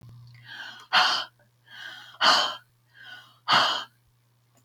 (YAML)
exhalation_length: 4.6 s
exhalation_amplitude: 21210
exhalation_signal_mean_std_ratio: 0.41
survey_phase: beta (2021-08-13 to 2022-03-07)
age: 65+
gender: Female
wearing_mask: 'No'
symptom_none: true
smoker_status: Ex-smoker
respiratory_condition_asthma: false
respiratory_condition_other: false
recruitment_source: REACT
submission_delay: 1 day
covid_test_result: Negative
covid_test_method: RT-qPCR
influenza_a_test_result: Negative
influenza_b_test_result: Negative